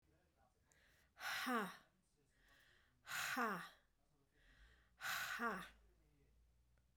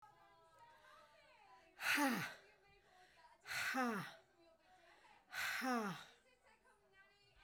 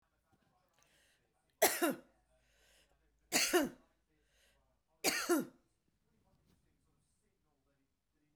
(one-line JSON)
{"cough_length": "7.0 s", "cough_amplitude": 1206, "cough_signal_mean_std_ratio": 0.44, "exhalation_length": "7.4 s", "exhalation_amplitude": 1747, "exhalation_signal_mean_std_ratio": 0.45, "three_cough_length": "8.4 s", "three_cough_amplitude": 5517, "three_cough_signal_mean_std_ratio": 0.28, "survey_phase": "beta (2021-08-13 to 2022-03-07)", "age": "45-64", "gender": "Female", "wearing_mask": "No", "symptom_none": true, "smoker_status": "Never smoked", "respiratory_condition_asthma": false, "respiratory_condition_other": false, "recruitment_source": "REACT", "submission_delay": "1 day", "covid_test_result": "Negative", "covid_test_method": "RT-qPCR"}